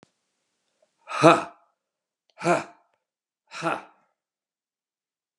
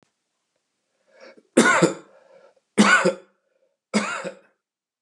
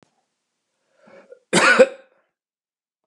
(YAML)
exhalation_length: 5.4 s
exhalation_amplitude: 30335
exhalation_signal_mean_std_ratio: 0.23
three_cough_length: 5.0 s
three_cough_amplitude: 30232
three_cough_signal_mean_std_ratio: 0.34
cough_length: 3.1 s
cough_amplitude: 32691
cough_signal_mean_std_ratio: 0.26
survey_phase: beta (2021-08-13 to 2022-03-07)
age: 45-64
gender: Male
wearing_mask: 'No'
symptom_none: true
symptom_onset: 12 days
smoker_status: Never smoked
respiratory_condition_asthma: false
respiratory_condition_other: false
recruitment_source: REACT
submission_delay: 2 days
covid_test_result: Negative
covid_test_method: RT-qPCR